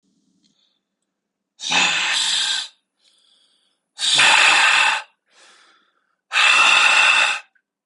{"exhalation_length": "7.9 s", "exhalation_amplitude": 28396, "exhalation_signal_mean_std_ratio": 0.54, "survey_phase": "beta (2021-08-13 to 2022-03-07)", "age": "18-44", "gender": "Male", "wearing_mask": "No", "symptom_none": true, "smoker_status": "Ex-smoker", "respiratory_condition_asthma": false, "respiratory_condition_other": false, "recruitment_source": "REACT", "submission_delay": "1 day", "covid_test_result": "Negative", "covid_test_method": "RT-qPCR"}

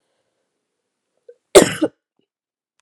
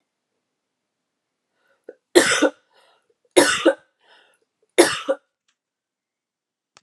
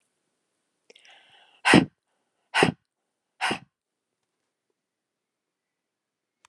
{"cough_length": "2.8 s", "cough_amplitude": 32768, "cough_signal_mean_std_ratio": 0.19, "three_cough_length": "6.8 s", "three_cough_amplitude": 32768, "three_cough_signal_mean_std_ratio": 0.27, "exhalation_length": "6.5 s", "exhalation_amplitude": 24462, "exhalation_signal_mean_std_ratio": 0.19, "survey_phase": "alpha (2021-03-01 to 2021-08-12)", "age": "45-64", "gender": "Female", "wearing_mask": "No", "symptom_fatigue": true, "symptom_onset": "3 days", "smoker_status": "Never smoked", "respiratory_condition_asthma": false, "respiratory_condition_other": false, "recruitment_source": "Test and Trace", "submission_delay": "2 days", "covid_test_result": "Positive", "covid_test_method": "RT-qPCR", "covid_ct_value": 19.1, "covid_ct_gene": "ORF1ab gene"}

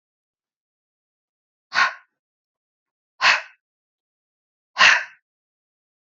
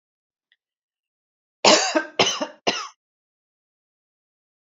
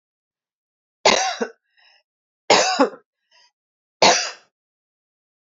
{"exhalation_length": "6.1 s", "exhalation_amplitude": 29448, "exhalation_signal_mean_std_ratio": 0.23, "cough_length": "4.6 s", "cough_amplitude": 27337, "cough_signal_mean_std_ratio": 0.28, "three_cough_length": "5.5 s", "three_cough_amplitude": 30033, "three_cough_signal_mean_std_ratio": 0.31, "survey_phase": "alpha (2021-03-01 to 2021-08-12)", "age": "45-64", "gender": "Female", "wearing_mask": "No", "symptom_none": true, "smoker_status": "Never smoked", "respiratory_condition_asthma": false, "respiratory_condition_other": false, "recruitment_source": "REACT", "submission_delay": "1 day", "covid_test_result": "Negative", "covid_test_method": "RT-qPCR"}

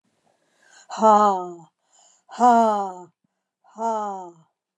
{"exhalation_length": "4.8 s", "exhalation_amplitude": 24457, "exhalation_signal_mean_std_ratio": 0.41, "survey_phase": "beta (2021-08-13 to 2022-03-07)", "age": "65+", "gender": "Female", "wearing_mask": "No", "symptom_cough_any": true, "smoker_status": "Never smoked", "respiratory_condition_asthma": false, "respiratory_condition_other": false, "recruitment_source": "REACT", "submission_delay": "1 day", "covid_test_result": "Negative", "covid_test_method": "RT-qPCR", "influenza_a_test_result": "Unknown/Void", "influenza_b_test_result": "Unknown/Void"}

